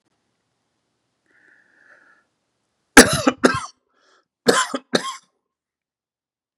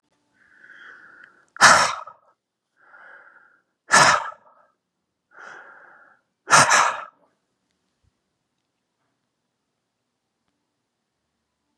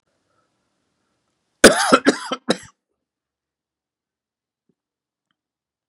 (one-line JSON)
{"three_cough_length": "6.6 s", "three_cough_amplitude": 32768, "three_cough_signal_mean_std_ratio": 0.22, "exhalation_length": "11.8 s", "exhalation_amplitude": 31516, "exhalation_signal_mean_std_ratio": 0.25, "cough_length": "5.9 s", "cough_amplitude": 32768, "cough_signal_mean_std_ratio": 0.2, "survey_phase": "beta (2021-08-13 to 2022-03-07)", "age": "45-64", "gender": "Male", "wearing_mask": "No", "symptom_cough_any": true, "symptom_new_continuous_cough": true, "symptom_runny_or_blocked_nose": true, "symptom_abdominal_pain": true, "symptom_fatigue": true, "symptom_change_to_sense_of_smell_or_taste": true, "symptom_onset": "3 days", "smoker_status": "Never smoked", "respiratory_condition_asthma": false, "respiratory_condition_other": false, "recruitment_source": "REACT", "submission_delay": "1 day", "covid_test_result": "Positive", "covid_test_method": "RT-qPCR", "covid_ct_value": 19.0, "covid_ct_gene": "E gene", "influenza_a_test_result": "Negative", "influenza_b_test_result": "Negative"}